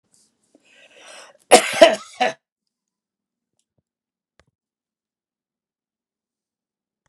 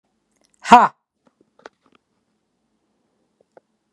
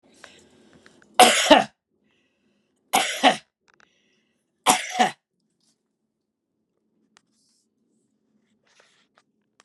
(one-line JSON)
{"cough_length": "7.1 s", "cough_amplitude": 32768, "cough_signal_mean_std_ratio": 0.17, "exhalation_length": "3.9 s", "exhalation_amplitude": 32768, "exhalation_signal_mean_std_ratio": 0.16, "three_cough_length": "9.6 s", "three_cough_amplitude": 32767, "three_cough_signal_mean_std_ratio": 0.24, "survey_phase": "beta (2021-08-13 to 2022-03-07)", "age": "45-64", "gender": "Male", "wearing_mask": "No", "symptom_none": true, "smoker_status": "Ex-smoker", "respiratory_condition_asthma": false, "respiratory_condition_other": false, "recruitment_source": "Test and Trace", "submission_delay": "2 days", "covid_test_result": "Positive", "covid_test_method": "RT-qPCR", "covid_ct_value": 28.7, "covid_ct_gene": "N gene"}